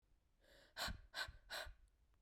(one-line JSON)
{"exhalation_length": "2.2 s", "exhalation_amplitude": 798, "exhalation_signal_mean_std_ratio": 0.5, "survey_phase": "beta (2021-08-13 to 2022-03-07)", "age": "18-44", "gender": "Female", "wearing_mask": "No", "symptom_new_continuous_cough": true, "symptom_runny_or_blocked_nose": true, "symptom_fatigue": true, "symptom_headache": true, "symptom_onset": "5 days", "smoker_status": "Never smoked", "respiratory_condition_asthma": false, "respiratory_condition_other": false, "recruitment_source": "Test and Trace", "submission_delay": "1 day", "covid_test_result": "Negative", "covid_test_method": "RT-qPCR"}